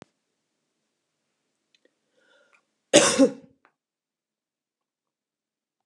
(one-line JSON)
{"cough_length": "5.9 s", "cough_amplitude": 28400, "cough_signal_mean_std_ratio": 0.18, "survey_phase": "alpha (2021-03-01 to 2021-08-12)", "age": "65+", "gender": "Female", "wearing_mask": "No", "symptom_none": true, "smoker_status": "Ex-smoker", "respiratory_condition_asthma": false, "respiratory_condition_other": false, "recruitment_source": "REACT", "submission_delay": "2 days", "covid_test_result": "Negative", "covid_test_method": "RT-qPCR"}